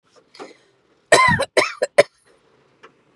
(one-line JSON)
{"three_cough_length": "3.2 s", "three_cough_amplitude": 32767, "three_cough_signal_mean_std_ratio": 0.32, "survey_phase": "beta (2021-08-13 to 2022-03-07)", "age": "18-44", "gender": "Female", "wearing_mask": "No", "symptom_none": true, "smoker_status": "Never smoked", "respiratory_condition_asthma": false, "respiratory_condition_other": false, "recruitment_source": "REACT", "submission_delay": "1 day", "covid_test_result": "Negative", "covid_test_method": "RT-qPCR", "influenza_a_test_result": "Negative", "influenza_b_test_result": "Negative"}